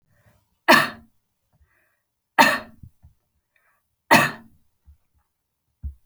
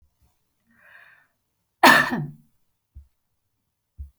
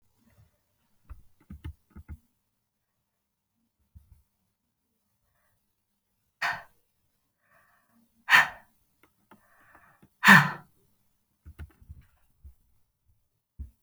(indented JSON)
{
  "three_cough_length": "6.1 s",
  "three_cough_amplitude": 31363,
  "three_cough_signal_mean_std_ratio": 0.24,
  "cough_length": "4.2 s",
  "cough_amplitude": 32768,
  "cough_signal_mean_std_ratio": 0.23,
  "exhalation_length": "13.8 s",
  "exhalation_amplitude": 30299,
  "exhalation_signal_mean_std_ratio": 0.16,
  "survey_phase": "beta (2021-08-13 to 2022-03-07)",
  "age": "45-64",
  "gender": "Female",
  "wearing_mask": "No",
  "symptom_none": true,
  "smoker_status": "Never smoked",
  "respiratory_condition_asthma": false,
  "respiratory_condition_other": false,
  "recruitment_source": "REACT",
  "submission_delay": "1 day",
  "covid_test_result": "Negative",
  "covid_test_method": "RT-qPCR"
}